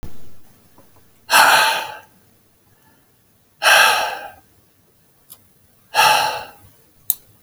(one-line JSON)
{"exhalation_length": "7.4 s", "exhalation_amplitude": 32768, "exhalation_signal_mean_std_ratio": 0.4, "survey_phase": "beta (2021-08-13 to 2022-03-07)", "age": "65+", "gender": "Male", "wearing_mask": "No", "symptom_none": true, "smoker_status": "Ex-smoker", "respiratory_condition_asthma": false, "respiratory_condition_other": false, "recruitment_source": "REACT", "submission_delay": "1 day", "covid_test_result": "Negative", "covid_test_method": "RT-qPCR"}